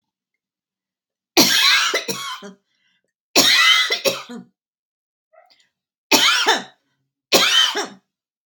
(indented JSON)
{
  "cough_length": "8.5 s",
  "cough_amplitude": 32767,
  "cough_signal_mean_std_ratio": 0.45,
  "survey_phase": "beta (2021-08-13 to 2022-03-07)",
  "age": "45-64",
  "gender": "Female",
  "wearing_mask": "No",
  "symptom_sore_throat": true,
  "symptom_headache": true,
  "smoker_status": "Never smoked",
  "respiratory_condition_asthma": false,
  "respiratory_condition_other": false,
  "recruitment_source": "REACT",
  "submission_delay": "1 day",
  "covid_test_result": "Negative",
  "covid_test_method": "RT-qPCR"
}